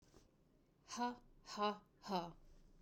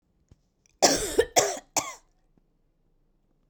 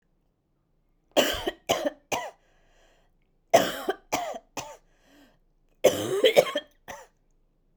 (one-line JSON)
{"exhalation_length": "2.8 s", "exhalation_amplitude": 1651, "exhalation_signal_mean_std_ratio": 0.45, "cough_length": "3.5 s", "cough_amplitude": 17565, "cough_signal_mean_std_ratio": 0.32, "three_cough_length": "7.8 s", "three_cough_amplitude": 22197, "three_cough_signal_mean_std_ratio": 0.34, "survey_phase": "beta (2021-08-13 to 2022-03-07)", "age": "45-64", "gender": "Female", "wearing_mask": "No", "symptom_cough_any": true, "symptom_new_continuous_cough": true, "symptom_runny_or_blocked_nose": true, "symptom_shortness_of_breath": true, "symptom_sore_throat": true, "symptom_fatigue": true, "symptom_fever_high_temperature": true, "symptom_headache": true, "symptom_onset": "5 days", "smoker_status": "Never smoked", "respiratory_condition_asthma": false, "respiratory_condition_other": false, "recruitment_source": "REACT", "submission_delay": "2 days", "covid_test_result": "Positive", "covid_test_method": "RT-qPCR", "covid_ct_value": 23.0, "covid_ct_gene": "E gene", "influenza_a_test_result": "Negative", "influenza_b_test_result": "Negative"}